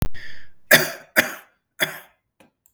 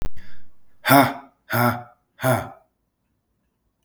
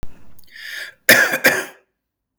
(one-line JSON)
{"three_cough_length": "2.7 s", "three_cough_amplitude": 32768, "three_cough_signal_mean_std_ratio": 0.43, "exhalation_length": "3.8 s", "exhalation_amplitude": 32766, "exhalation_signal_mean_std_ratio": 0.46, "cough_length": "2.4 s", "cough_amplitude": 32768, "cough_signal_mean_std_ratio": 0.43, "survey_phase": "beta (2021-08-13 to 2022-03-07)", "age": "45-64", "gender": "Male", "wearing_mask": "No", "symptom_none": true, "smoker_status": "Current smoker (11 or more cigarettes per day)", "respiratory_condition_asthma": false, "respiratory_condition_other": false, "recruitment_source": "REACT", "submission_delay": "1 day", "covid_test_result": "Negative", "covid_test_method": "RT-qPCR"}